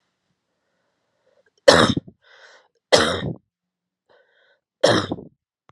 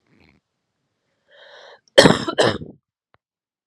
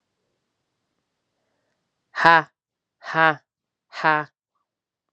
{"three_cough_length": "5.7 s", "three_cough_amplitude": 32768, "three_cough_signal_mean_std_ratio": 0.28, "cough_length": "3.7 s", "cough_amplitude": 32768, "cough_signal_mean_std_ratio": 0.25, "exhalation_length": "5.1 s", "exhalation_amplitude": 32767, "exhalation_signal_mean_std_ratio": 0.22, "survey_phase": "alpha (2021-03-01 to 2021-08-12)", "age": "18-44", "gender": "Female", "wearing_mask": "No", "symptom_new_continuous_cough": true, "symptom_diarrhoea": true, "symptom_fatigue": true, "symptom_headache": true, "symptom_change_to_sense_of_smell_or_taste": true, "symptom_loss_of_taste": true, "symptom_onset": "3 days", "smoker_status": "Never smoked", "respiratory_condition_asthma": false, "respiratory_condition_other": false, "recruitment_source": "Test and Trace", "submission_delay": "2 days", "covid_test_result": "Positive", "covid_test_method": "RT-qPCR", "covid_ct_value": 15.2, "covid_ct_gene": "ORF1ab gene", "covid_ct_mean": 15.2, "covid_viral_load": "10000000 copies/ml", "covid_viral_load_category": "High viral load (>1M copies/ml)"}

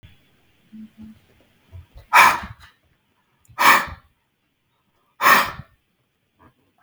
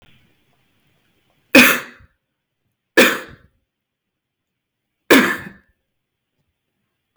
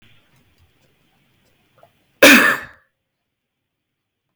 {"exhalation_length": "6.8 s", "exhalation_amplitude": 32768, "exhalation_signal_mean_std_ratio": 0.28, "three_cough_length": "7.2 s", "three_cough_amplitude": 32768, "three_cough_signal_mean_std_ratio": 0.24, "cough_length": "4.4 s", "cough_amplitude": 32768, "cough_signal_mean_std_ratio": 0.23, "survey_phase": "beta (2021-08-13 to 2022-03-07)", "age": "18-44", "gender": "Male", "wearing_mask": "No", "symptom_cough_any": true, "symptom_sore_throat": true, "symptom_fatigue": true, "symptom_headache": true, "symptom_change_to_sense_of_smell_or_taste": true, "symptom_onset": "2 days", "smoker_status": "Never smoked", "respiratory_condition_asthma": true, "respiratory_condition_other": false, "recruitment_source": "Test and Trace", "submission_delay": "2 days", "covid_test_result": "Positive", "covid_test_method": "RT-qPCR", "covid_ct_value": 30.2, "covid_ct_gene": "N gene"}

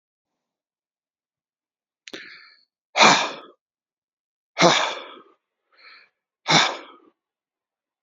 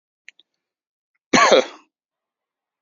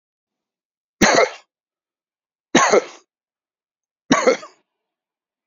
{"exhalation_length": "8.0 s", "exhalation_amplitude": 28130, "exhalation_signal_mean_std_ratio": 0.27, "cough_length": "2.8 s", "cough_amplitude": 29580, "cough_signal_mean_std_ratio": 0.26, "three_cough_length": "5.5 s", "three_cough_amplitude": 30007, "three_cough_signal_mean_std_ratio": 0.3, "survey_phase": "beta (2021-08-13 to 2022-03-07)", "age": "45-64", "gender": "Male", "wearing_mask": "No", "symptom_none": true, "smoker_status": "Never smoked", "respiratory_condition_asthma": false, "respiratory_condition_other": false, "recruitment_source": "REACT", "submission_delay": "3 days", "covid_test_result": "Negative", "covid_test_method": "RT-qPCR"}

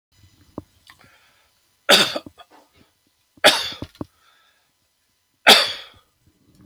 {"three_cough_length": "6.7 s", "three_cough_amplitude": 31838, "three_cough_signal_mean_std_ratio": 0.25, "survey_phase": "beta (2021-08-13 to 2022-03-07)", "age": "65+", "gender": "Male", "wearing_mask": "No", "symptom_none": true, "smoker_status": "Never smoked", "respiratory_condition_asthma": false, "respiratory_condition_other": false, "recruitment_source": "REACT", "submission_delay": "3 days", "covid_test_result": "Negative", "covid_test_method": "RT-qPCR", "influenza_a_test_result": "Negative", "influenza_b_test_result": "Negative"}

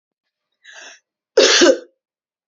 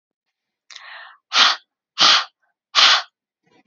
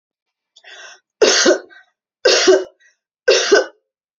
{"cough_length": "2.5 s", "cough_amplitude": 32740, "cough_signal_mean_std_ratio": 0.34, "exhalation_length": "3.7 s", "exhalation_amplitude": 31021, "exhalation_signal_mean_std_ratio": 0.36, "three_cough_length": "4.2 s", "three_cough_amplitude": 32767, "three_cough_signal_mean_std_ratio": 0.43, "survey_phase": "beta (2021-08-13 to 2022-03-07)", "age": "18-44", "gender": "Female", "wearing_mask": "No", "symptom_runny_or_blocked_nose": true, "symptom_sore_throat": true, "smoker_status": "Never smoked", "respiratory_condition_asthma": false, "respiratory_condition_other": false, "recruitment_source": "REACT", "submission_delay": "2 days", "covid_test_result": "Negative", "covid_test_method": "RT-qPCR", "influenza_a_test_result": "Negative", "influenza_b_test_result": "Negative"}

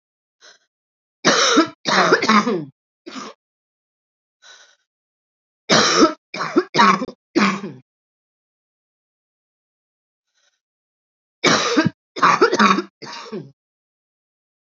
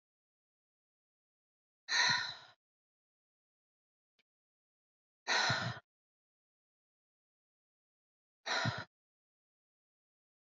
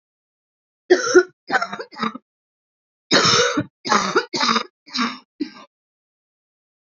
{"three_cough_length": "14.7 s", "three_cough_amplitude": 32767, "three_cough_signal_mean_std_ratio": 0.38, "exhalation_length": "10.4 s", "exhalation_amplitude": 4403, "exhalation_signal_mean_std_ratio": 0.27, "cough_length": "7.0 s", "cough_amplitude": 27484, "cough_signal_mean_std_ratio": 0.4, "survey_phase": "beta (2021-08-13 to 2022-03-07)", "age": "18-44", "gender": "Female", "wearing_mask": "No", "symptom_cough_any": true, "symptom_sore_throat": true, "symptom_fatigue": true, "symptom_headache": true, "symptom_onset": "3 days", "smoker_status": "Current smoker (e-cigarettes or vapes only)", "respiratory_condition_asthma": false, "respiratory_condition_other": false, "recruitment_source": "Test and Trace", "submission_delay": "2 days", "covid_test_result": "Negative", "covid_test_method": "RT-qPCR"}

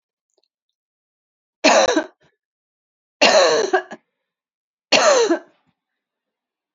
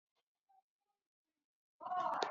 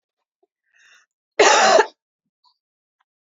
{"three_cough_length": "6.7 s", "three_cough_amplitude": 32767, "three_cough_signal_mean_std_ratio": 0.37, "exhalation_length": "2.3 s", "exhalation_amplitude": 3075, "exhalation_signal_mean_std_ratio": 0.36, "cough_length": "3.3 s", "cough_amplitude": 30145, "cough_signal_mean_std_ratio": 0.3, "survey_phase": "beta (2021-08-13 to 2022-03-07)", "age": "45-64", "gender": "Female", "wearing_mask": "No", "symptom_cough_any": true, "symptom_runny_or_blocked_nose": true, "symptom_onset": "2 days", "smoker_status": "Never smoked", "respiratory_condition_asthma": false, "respiratory_condition_other": false, "recruitment_source": "Test and Trace", "submission_delay": "1 day", "covid_test_result": "Positive", "covid_test_method": "RT-qPCR", "covid_ct_value": 20.5, "covid_ct_gene": "ORF1ab gene", "covid_ct_mean": 21.3, "covid_viral_load": "100000 copies/ml", "covid_viral_load_category": "Low viral load (10K-1M copies/ml)"}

